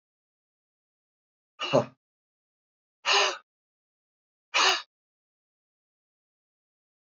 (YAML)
exhalation_length: 7.2 s
exhalation_amplitude: 14127
exhalation_signal_mean_std_ratio: 0.25
survey_phase: beta (2021-08-13 to 2022-03-07)
age: 45-64
gender: Male
wearing_mask: 'No'
symptom_cough_any: true
symptom_runny_or_blocked_nose: true
symptom_fatigue: true
symptom_change_to_sense_of_smell_or_taste: true
smoker_status: Never smoked
respiratory_condition_asthma: false
respiratory_condition_other: false
recruitment_source: Test and Trace
submission_delay: 2 days
covid_test_result: Positive
covid_test_method: RT-qPCR
covid_ct_value: 11.7
covid_ct_gene: ORF1ab gene
covid_ct_mean: 12.0
covid_viral_load: 110000000 copies/ml
covid_viral_load_category: High viral load (>1M copies/ml)